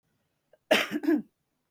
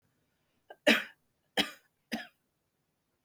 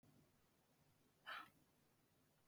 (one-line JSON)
{"cough_length": "1.7 s", "cough_amplitude": 12178, "cough_signal_mean_std_ratio": 0.39, "three_cough_length": "3.2 s", "three_cough_amplitude": 11091, "three_cough_signal_mean_std_ratio": 0.23, "exhalation_length": "2.5 s", "exhalation_amplitude": 337, "exhalation_signal_mean_std_ratio": 0.39, "survey_phase": "beta (2021-08-13 to 2022-03-07)", "age": "18-44", "gender": "Female", "wearing_mask": "No", "symptom_cough_any": true, "symptom_runny_or_blocked_nose": true, "smoker_status": "Never smoked", "respiratory_condition_asthma": false, "respiratory_condition_other": false, "recruitment_source": "REACT", "submission_delay": "6 days", "covid_test_result": "Positive", "covid_test_method": "RT-qPCR", "covid_ct_value": 26.0, "covid_ct_gene": "E gene", "influenza_a_test_result": "Negative", "influenza_b_test_result": "Negative"}